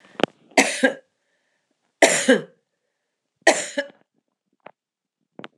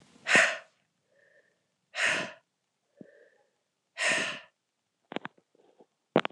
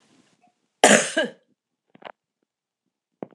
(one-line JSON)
{"three_cough_length": "5.6 s", "three_cough_amplitude": 26028, "three_cough_signal_mean_std_ratio": 0.29, "exhalation_length": "6.3 s", "exhalation_amplitude": 14247, "exhalation_signal_mean_std_ratio": 0.3, "cough_length": "3.3 s", "cough_amplitude": 26028, "cough_signal_mean_std_ratio": 0.24, "survey_phase": "alpha (2021-03-01 to 2021-08-12)", "age": "45-64", "gender": "Female", "wearing_mask": "No", "symptom_cough_any": true, "symptom_shortness_of_breath": true, "symptom_abdominal_pain": true, "symptom_fatigue": true, "symptom_headache": true, "symptom_loss_of_taste": true, "symptom_onset": "5 days", "smoker_status": "Never smoked", "respiratory_condition_asthma": false, "respiratory_condition_other": false, "recruitment_source": "Test and Trace", "submission_delay": "2 days", "covid_test_result": "Positive", "covid_test_method": "RT-qPCR"}